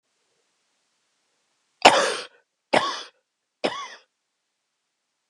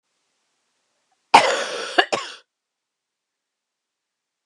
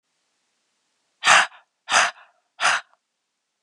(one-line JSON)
{"three_cough_length": "5.3 s", "three_cough_amplitude": 32768, "three_cough_signal_mean_std_ratio": 0.23, "cough_length": "4.5 s", "cough_amplitude": 32768, "cough_signal_mean_std_ratio": 0.24, "exhalation_length": "3.6 s", "exhalation_amplitude": 30377, "exhalation_signal_mean_std_ratio": 0.31, "survey_phase": "alpha (2021-03-01 to 2021-08-12)", "age": "45-64", "gender": "Female", "wearing_mask": "No", "symptom_cough_any": true, "symptom_fatigue": true, "symptom_fever_high_temperature": true, "smoker_status": "Never smoked", "respiratory_condition_asthma": false, "respiratory_condition_other": false, "recruitment_source": "Test and Trace", "submission_delay": "2 days", "covid_test_result": "Positive", "covid_test_method": "RT-qPCR", "covid_ct_value": 22.5, "covid_ct_gene": "ORF1ab gene", "covid_ct_mean": 23.1, "covid_viral_load": "26000 copies/ml", "covid_viral_load_category": "Low viral load (10K-1M copies/ml)"}